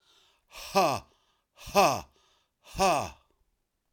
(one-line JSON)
{"exhalation_length": "3.9 s", "exhalation_amplitude": 14045, "exhalation_signal_mean_std_ratio": 0.37, "survey_phase": "beta (2021-08-13 to 2022-03-07)", "age": "45-64", "gender": "Male", "wearing_mask": "No", "symptom_none": true, "smoker_status": "Ex-smoker", "respiratory_condition_asthma": false, "respiratory_condition_other": false, "recruitment_source": "REACT", "submission_delay": "3 days", "covid_test_result": "Negative", "covid_test_method": "RT-qPCR", "influenza_a_test_result": "Negative", "influenza_b_test_result": "Negative"}